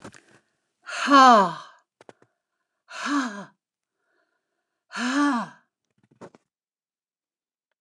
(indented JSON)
{
  "exhalation_length": "7.8 s",
  "exhalation_amplitude": 26309,
  "exhalation_signal_mean_std_ratio": 0.3,
  "survey_phase": "alpha (2021-03-01 to 2021-08-12)",
  "age": "65+",
  "gender": "Female",
  "wearing_mask": "No",
  "symptom_none": true,
  "smoker_status": "Never smoked",
  "respiratory_condition_asthma": false,
  "respiratory_condition_other": false,
  "recruitment_source": "REACT",
  "submission_delay": "1 day",
  "covid_test_result": "Negative",
  "covid_test_method": "RT-qPCR"
}